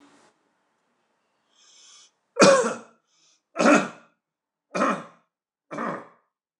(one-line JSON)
{"three_cough_length": "6.6 s", "three_cough_amplitude": 29134, "three_cough_signal_mean_std_ratio": 0.3, "survey_phase": "beta (2021-08-13 to 2022-03-07)", "age": "65+", "gender": "Male", "wearing_mask": "No", "symptom_none": true, "smoker_status": "Never smoked", "respiratory_condition_asthma": false, "respiratory_condition_other": false, "recruitment_source": "REACT", "submission_delay": "2 days", "covid_test_result": "Negative", "covid_test_method": "RT-qPCR", "influenza_a_test_result": "Negative", "influenza_b_test_result": "Negative"}